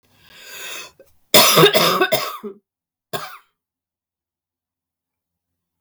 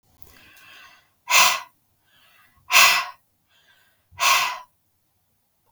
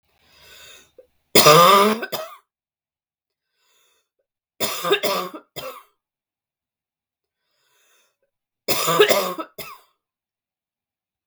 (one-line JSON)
{"cough_length": "5.8 s", "cough_amplitude": 32768, "cough_signal_mean_std_ratio": 0.33, "exhalation_length": "5.7 s", "exhalation_amplitude": 32173, "exhalation_signal_mean_std_ratio": 0.33, "three_cough_length": "11.3 s", "three_cough_amplitude": 32768, "three_cough_signal_mean_std_ratio": 0.31, "survey_phase": "beta (2021-08-13 to 2022-03-07)", "age": "45-64", "gender": "Female", "wearing_mask": "No", "symptom_cough_any": true, "symptom_new_continuous_cough": true, "symptom_runny_or_blocked_nose": true, "symptom_headache": true, "symptom_other": true, "symptom_onset": "4 days", "smoker_status": "Never smoked", "respiratory_condition_asthma": false, "respiratory_condition_other": false, "recruitment_source": "Test and Trace", "submission_delay": "2 days", "covid_test_result": "Positive", "covid_test_method": "RT-qPCR", "covid_ct_value": 19.3, "covid_ct_gene": "ORF1ab gene"}